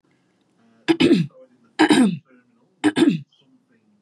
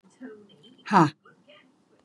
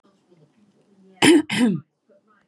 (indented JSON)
{
  "three_cough_length": "4.0 s",
  "three_cough_amplitude": 25696,
  "three_cough_signal_mean_std_ratio": 0.41,
  "exhalation_length": "2.0 s",
  "exhalation_amplitude": 21513,
  "exhalation_signal_mean_std_ratio": 0.26,
  "cough_length": "2.5 s",
  "cough_amplitude": 30251,
  "cough_signal_mean_std_ratio": 0.36,
  "survey_phase": "beta (2021-08-13 to 2022-03-07)",
  "age": "45-64",
  "gender": "Female",
  "wearing_mask": "No",
  "symptom_none": true,
  "smoker_status": "Ex-smoker",
  "respiratory_condition_asthma": false,
  "respiratory_condition_other": false,
  "recruitment_source": "REACT",
  "submission_delay": "2 days",
  "covid_test_result": "Negative",
  "covid_test_method": "RT-qPCR",
  "influenza_a_test_result": "Negative",
  "influenza_b_test_result": "Negative"
}